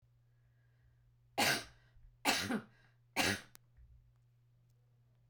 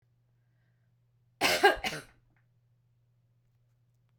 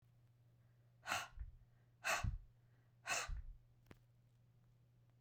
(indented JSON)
{
  "three_cough_length": "5.3 s",
  "three_cough_amplitude": 4773,
  "three_cough_signal_mean_std_ratio": 0.34,
  "cough_length": "4.2 s",
  "cough_amplitude": 13432,
  "cough_signal_mean_std_ratio": 0.25,
  "exhalation_length": "5.2 s",
  "exhalation_amplitude": 1905,
  "exhalation_signal_mean_std_ratio": 0.42,
  "survey_phase": "beta (2021-08-13 to 2022-03-07)",
  "age": "65+",
  "gender": "Female",
  "wearing_mask": "No",
  "symptom_none": true,
  "smoker_status": "Never smoked",
  "respiratory_condition_asthma": false,
  "respiratory_condition_other": false,
  "recruitment_source": "REACT",
  "submission_delay": "1 day",
  "covid_test_result": "Negative",
  "covid_test_method": "RT-qPCR"
}